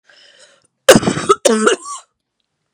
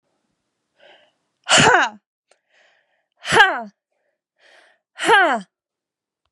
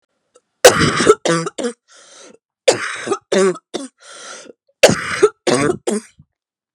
{
  "cough_length": "2.7 s",
  "cough_amplitude": 32768,
  "cough_signal_mean_std_ratio": 0.38,
  "exhalation_length": "6.3 s",
  "exhalation_amplitude": 32767,
  "exhalation_signal_mean_std_ratio": 0.32,
  "three_cough_length": "6.7 s",
  "three_cough_amplitude": 32768,
  "three_cough_signal_mean_std_ratio": 0.42,
  "survey_phase": "beta (2021-08-13 to 2022-03-07)",
  "age": "18-44",
  "gender": "Female",
  "wearing_mask": "No",
  "symptom_cough_any": true,
  "symptom_runny_or_blocked_nose": true,
  "symptom_sore_throat": true,
  "symptom_fatigue": true,
  "symptom_headache": true,
  "symptom_onset": "11 days",
  "smoker_status": "Never smoked",
  "respiratory_condition_asthma": false,
  "respiratory_condition_other": false,
  "recruitment_source": "REACT",
  "submission_delay": "1 day",
  "covid_test_result": "Positive",
  "covid_test_method": "RT-qPCR",
  "covid_ct_value": 29.4,
  "covid_ct_gene": "E gene",
  "influenza_a_test_result": "Negative",
  "influenza_b_test_result": "Negative"
}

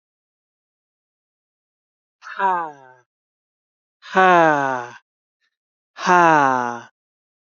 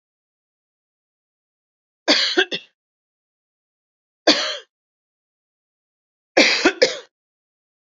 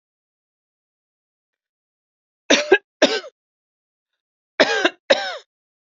{
  "exhalation_length": "7.6 s",
  "exhalation_amplitude": 28913,
  "exhalation_signal_mean_std_ratio": 0.32,
  "three_cough_length": "7.9 s",
  "three_cough_amplitude": 31050,
  "three_cough_signal_mean_std_ratio": 0.27,
  "cough_length": "5.8 s",
  "cough_amplitude": 30021,
  "cough_signal_mean_std_ratio": 0.27,
  "survey_phase": "alpha (2021-03-01 to 2021-08-12)",
  "age": "45-64",
  "gender": "Female",
  "wearing_mask": "No",
  "symptom_none": true,
  "smoker_status": "Ex-smoker",
  "respiratory_condition_asthma": false,
  "respiratory_condition_other": false,
  "recruitment_source": "REACT",
  "submission_delay": "5 days",
  "covid_test_result": "Negative",
  "covid_test_method": "RT-qPCR"
}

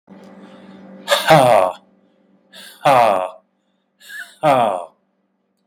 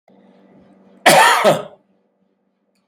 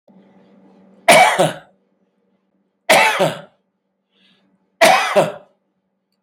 {
  "exhalation_length": "5.7 s",
  "exhalation_amplitude": 32768,
  "exhalation_signal_mean_std_ratio": 0.41,
  "cough_length": "2.9 s",
  "cough_amplitude": 32768,
  "cough_signal_mean_std_ratio": 0.36,
  "three_cough_length": "6.2 s",
  "three_cough_amplitude": 32768,
  "three_cough_signal_mean_std_ratio": 0.37,
  "survey_phase": "beta (2021-08-13 to 2022-03-07)",
  "age": "45-64",
  "gender": "Male",
  "wearing_mask": "No",
  "symptom_diarrhoea": true,
  "smoker_status": "Never smoked",
  "respiratory_condition_asthma": false,
  "respiratory_condition_other": false,
  "recruitment_source": "REACT",
  "submission_delay": "2 days",
  "covid_test_result": "Negative",
  "covid_test_method": "RT-qPCR",
  "influenza_a_test_result": "Negative",
  "influenza_b_test_result": "Negative"
}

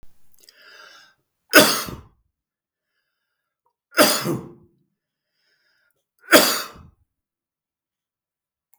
{
  "three_cough_length": "8.8 s",
  "three_cough_amplitude": 32768,
  "three_cough_signal_mean_std_ratio": 0.25,
  "survey_phase": "beta (2021-08-13 to 2022-03-07)",
  "age": "65+",
  "gender": "Male",
  "wearing_mask": "No",
  "symptom_none": true,
  "smoker_status": "Never smoked",
  "respiratory_condition_asthma": false,
  "respiratory_condition_other": false,
  "recruitment_source": "REACT",
  "submission_delay": "2 days",
  "covid_test_result": "Negative",
  "covid_test_method": "RT-qPCR",
  "influenza_a_test_result": "Negative",
  "influenza_b_test_result": "Negative"
}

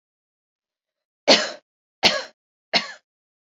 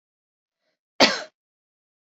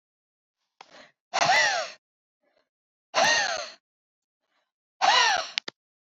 {
  "three_cough_length": "3.4 s",
  "three_cough_amplitude": 30983,
  "three_cough_signal_mean_std_ratio": 0.27,
  "cough_length": "2.0 s",
  "cough_amplitude": 28774,
  "cough_signal_mean_std_ratio": 0.2,
  "exhalation_length": "6.1 s",
  "exhalation_amplitude": 28193,
  "exhalation_signal_mean_std_ratio": 0.4,
  "survey_phase": "beta (2021-08-13 to 2022-03-07)",
  "age": "18-44",
  "gender": "Female",
  "wearing_mask": "No",
  "symptom_none": true,
  "smoker_status": "Never smoked",
  "respiratory_condition_asthma": false,
  "respiratory_condition_other": false,
  "recruitment_source": "REACT",
  "submission_delay": "2 days",
  "covid_test_result": "Negative",
  "covid_test_method": "RT-qPCR"
}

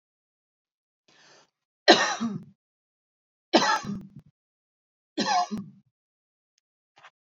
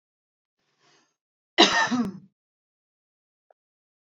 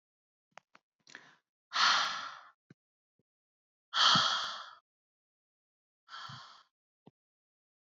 {
  "three_cough_length": "7.3 s",
  "three_cough_amplitude": 24170,
  "three_cough_signal_mean_std_ratio": 0.29,
  "cough_length": "4.2 s",
  "cough_amplitude": 25843,
  "cough_signal_mean_std_ratio": 0.25,
  "exhalation_length": "7.9 s",
  "exhalation_amplitude": 7643,
  "exhalation_signal_mean_std_ratio": 0.3,
  "survey_phase": "beta (2021-08-13 to 2022-03-07)",
  "age": "18-44",
  "gender": "Female",
  "wearing_mask": "No",
  "symptom_none": true,
  "smoker_status": "Ex-smoker",
  "respiratory_condition_asthma": false,
  "respiratory_condition_other": false,
  "recruitment_source": "REACT",
  "submission_delay": "4 days",
  "covid_test_result": "Negative",
  "covid_test_method": "RT-qPCR",
  "influenza_a_test_result": "Negative",
  "influenza_b_test_result": "Negative"
}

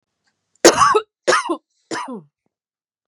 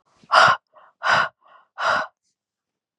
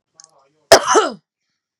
{
  "three_cough_length": "3.1 s",
  "three_cough_amplitude": 32768,
  "three_cough_signal_mean_std_ratio": 0.36,
  "exhalation_length": "3.0 s",
  "exhalation_amplitude": 27939,
  "exhalation_signal_mean_std_ratio": 0.39,
  "cough_length": "1.8 s",
  "cough_amplitude": 32768,
  "cough_signal_mean_std_ratio": 0.31,
  "survey_phase": "beta (2021-08-13 to 2022-03-07)",
  "age": "18-44",
  "gender": "Female",
  "wearing_mask": "Yes",
  "symptom_sore_throat": true,
  "symptom_headache": true,
  "symptom_onset": "4 days",
  "smoker_status": "Current smoker (1 to 10 cigarettes per day)",
  "respiratory_condition_asthma": false,
  "respiratory_condition_other": false,
  "recruitment_source": "Test and Trace",
  "submission_delay": "2 days",
  "covid_test_result": "Negative",
  "covid_test_method": "RT-qPCR"
}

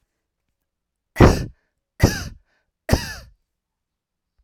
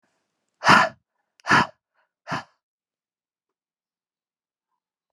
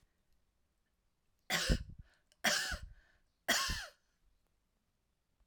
{
  "cough_length": "4.4 s",
  "cough_amplitude": 32768,
  "cough_signal_mean_std_ratio": 0.24,
  "exhalation_length": "5.1 s",
  "exhalation_amplitude": 31420,
  "exhalation_signal_mean_std_ratio": 0.23,
  "three_cough_length": "5.5 s",
  "three_cough_amplitude": 4966,
  "three_cough_signal_mean_std_ratio": 0.35,
  "survey_phase": "alpha (2021-03-01 to 2021-08-12)",
  "age": "65+",
  "gender": "Female",
  "wearing_mask": "No",
  "symptom_headache": true,
  "symptom_onset": "6 days",
  "smoker_status": "Never smoked",
  "respiratory_condition_asthma": false,
  "respiratory_condition_other": false,
  "recruitment_source": "Test and Trace",
  "submission_delay": "2 days",
  "covid_test_result": "Positive",
  "covid_test_method": "RT-qPCR",
  "covid_ct_value": 27.1,
  "covid_ct_gene": "ORF1ab gene",
  "covid_ct_mean": 27.3,
  "covid_viral_load": "1100 copies/ml",
  "covid_viral_load_category": "Minimal viral load (< 10K copies/ml)"
}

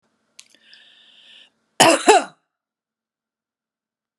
{
  "cough_length": "4.2 s",
  "cough_amplitude": 32767,
  "cough_signal_mean_std_ratio": 0.23,
  "survey_phase": "beta (2021-08-13 to 2022-03-07)",
  "age": "65+",
  "gender": "Female",
  "wearing_mask": "No",
  "symptom_runny_or_blocked_nose": true,
  "symptom_headache": true,
  "smoker_status": "Never smoked",
  "respiratory_condition_asthma": false,
  "respiratory_condition_other": false,
  "recruitment_source": "REACT",
  "submission_delay": "2 days",
  "covid_test_result": "Negative",
  "covid_test_method": "RT-qPCR"
}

